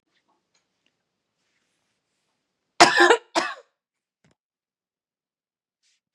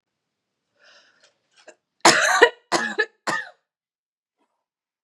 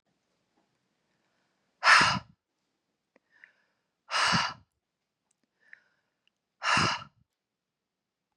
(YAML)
cough_length: 6.1 s
cough_amplitude: 32729
cough_signal_mean_std_ratio: 0.2
three_cough_length: 5.0 s
three_cough_amplitude: 32767
three_cough_signal_mean_std_ratio: 0.29
exhalation_length: 8.4 s
exhalation_amplitude: 16431
exhalation_signal_mean_std_ratio: 0.27
survey_phase: beta (2021-08-13 to 2022-03-07)
age: 18-44
gender: Female
wearing_mask: 'No'
symptom_none: true
smoker_status: Never smoked
respiratory_condition_asthma: false
respiratory_condition_other: false
recruitment_source: REACT
submission_delay: 1 day
covid_test_result: Negative
covid_test_method: RT-qPCR
influenza_a_test_result: Negative
influenza_b_test_result: Negative